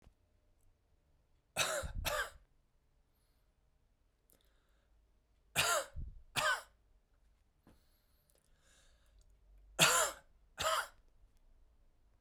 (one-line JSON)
{"three_cough_length": "12.2 s", "three_cough_amplitude": 7108, "three_cough_signal_mean_std_ratio": 0.32, "survey_phase": "beta (2021-08-13 to 2022-03-07)", "age": "45-64", "gender": "Male", "wearing_mask": "No", "symptom_sore_throat": true, "smoker_status": "Ex-smoker", "respiratory_condition_asthma": false, "respiratory_condition_other": false, "recruitment_source": "Test and Trace", "submission_delay": "1 day", "covid_test_result": "Positive", "covid_test_method": "RT-qPCR", "covid_ct_value": 33.1, "covid_ct_gene": "N gene", "covid_ct_mean": 34.2, "covid_viral_load": "6 copies/ml", "covid_viral_load_category": "Minimal viral load (< 10K copies/ml)"}